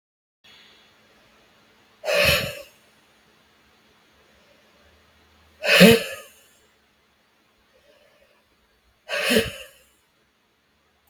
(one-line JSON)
{"exhalation_length": "11.1 s", "exhalation_amplitude": 32768, "exhalation_signal_mean_std_ratio": 0.25, "survey_phase": "beta (2021-08-13 to 2022-03-07)", "age": "18-44", "gender": "Female", "wearing_mask": "No", "symptom_runny_or_blocked_nose": true, "symptom_fatigue": true, "symptom_headache": true, "smoker_status": "Never smoked", "respiratory_condition_asthma": false, "respiratory_condition_other": false, "recruitment_source": "Test and Trace", "submission_delay": "1 day", "covid_test_result": "Negative", "covid_test_method": "RT-qPCR"}